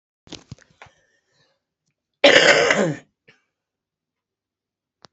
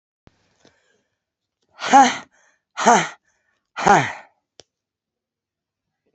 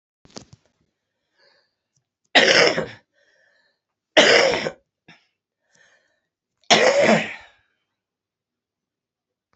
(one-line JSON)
{"cough_length": "5.1 s", "cough_amplitude": 30199, "cough_signal_mean_std_ratio": 0.28, "exhalation_length": "6.1 s", "exhalation_amplitude": 29392, "exhalation_signal_mean_std_ratio": 0.28, "three_cough_length": "9.6 s", "three_cough_amplitude": 29280, "three_cough_signal_mean_std_ratio": 0.32, "survey_phase": "beta (2021-08-13 to 2022-03-07)", "age": "45-64", "gender": "Female", "wearing_mask": "No", "symptom_cough_any": true, "symptom_runny_or_blocked_nose": true, "symptom_fatigue": true, "symptom_change_to_sense_of_smell_or_taste": true, "smoker_status": "Current smoker (1 to 10 cigarettes per day)", "respiratory_condition_asthma": true, "respiratory_condition_other": false, "recruitment_source": "Test and Trace", "submission_delay": "2 days", "covid_test_result": "Positive", "covid_test_method": "RT-qPCR", "covid_ct_value": 15.2, "covid_ct_gene": "ORF1ab gene", "covid_ct_mean": 15.4, "covid_viral_load": "8700000 copies/ml", "covid_viral_load_category": "High viral load (>1M copies/ml)"}